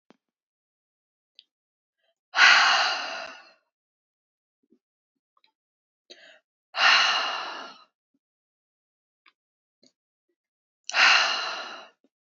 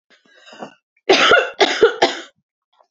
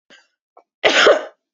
exhalation_length: 12.2 s
exhalation_amplitude: 23969
exhalation_signal_mean_std_ratio: 0.32
three_cough_length: 2.9 s
three_cough_amplitude: 30386
three_cough_signal_mean_std_ratio: 0.43
cough_length: 1.5 s
cough_amplitude: 28783
cough_signal_mean_std_ratio: 0.4
survey_phase: beta (2021-08-13 to 2022-03-07)
age: 18-44
gender: Female
wearing_mask: 'No'
symptom_cough_any: true
symptom_new_continuous_cough: true
symptom_runny_or_blocked_nose: true
symptom_sore_throat: true
symptom_fatigue: true
symptom_headache: true
symptom_other: true
symptom_onset: 3 days
smoker_status: Never smoked
respiratory_condition_asthma: false
respiratory_condition_other: false
recruitment_source: Test and Trace
submission_delay: 3 days
covid_test_result: Positive
covid_test_method: ePCR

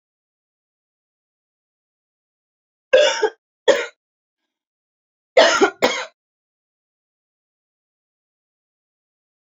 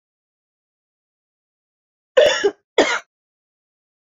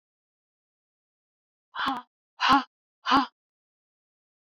three_cough_length: 9.5 s
three_cough_amplitude: 31020
three_cough_signal_mean_std_ratio: 0.24
cough_length: 4.2 s
cough_amplitude: 27867
cough_signal_mean_std_ratio: 0.26
exhalation_length: 4.5 s
exhalation_amplitude: 13188
exhalation_signal_mean_std_ratio: 0.27
survey_phase: beta (2021-08-13 to 2022-03-07)
age: 18-44
gender: Female
wearing_mask: 'Yes'
symptom_none: true
smoker_status: Never smoked
respiratory_condition_asthma: false
respiratory_condition_other: false
recruitment_source: REACT
submission_delay: 2 days
covid_test_result: Negative
covid_test_method: RT-qPCR
influenza_a_test_result: Unknown/Void
influenza_b_test_result: Unknown/Void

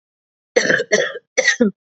three_cough_length: 1.9 s
three_cough_amplitude: 31417
three_cough_signal_mean_std_ratio: 0.5
survey_phase: beta (2021-08-13 to 2022-03-07)
age: 18-44
gender: Female
wearing_mask: 'No'
symptom_cough_any: true
symptom_runny_or_blocked_nose: true
symptom_sore_throat: true
symptom_fatigue: true
symptom_headache: true
symptom_onset: 3 days
smoker_status: Ex-smoker
respiratory_condition_asthma: false
respiratory_condition_other: false
recruitment_source: Test and Trace
submission_delay: 2 days
covid_test_result: Positive
covid_test_method: ePCR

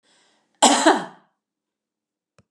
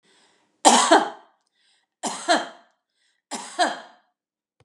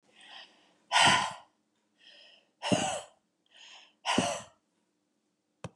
cough_length: 2.5 s
cough_amplitude: 32741
cough_signal_mean_std_ratio: 0.3
three_cough_length: 4.6 s
three_cough_amplitude: 32703
three_cough_signal_mean_std_ratio: 0.33
exhalation_length: 5.8 s
exhalation_amplitude: 10619
exhalation_signal_mean_std_ratio: 0.34
survey_phase: beta (2021-08-13 to 2022-03-07)
age: 65+
gender: Female
wearing_mask: 'Yes'
symptom_none: true
smoker_status: Ex-smoker
respiratory_condition_asthma: false
respiratory_condition_other: false
recruitment_source: REACT
submission_delay: 3 days
covid_test_result: Negative
covid_test_method: RT-qPCR
influenza_a_test_result: Negative
influenza_b_test_result: Negative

